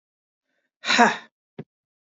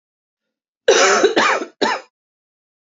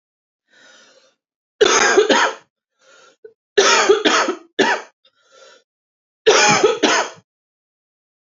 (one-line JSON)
{"exhalation_length": "2.0 s", "exhalation_amplitude": 27144, "exhalation_signal_mean_std_ratio": 0.28, "cough_length": "2.9 s", "cough_amplitude": 28879, "cough_signal_mean_std_ratio": 0.45, "three_cough_length": "8.4 s", "three_cough_amplitude": 29894, "three_cough_signal_mean_std_ratio": 0.44, "survey_phase": "alpha (2021-03-01 to 2021-08-12)", "age": "18-44", "gender": "Female", "wearing_mask": "No", "symptom_cough_any": true, "symptom_new_continuous_cough": true, "symptom_fever_high_temperature": true, "symptom_headache": true, "symptom_onset": "4 days", "smoker_status": "Never smoked", "respiratory_condition_asthma": true, "respiratory_condition_other": false, "recruitment_source": "Test and Trace", "submission_delay": "2 days", "covid_test_result": "Positive", "covid_test_method": "RT-qPCR"}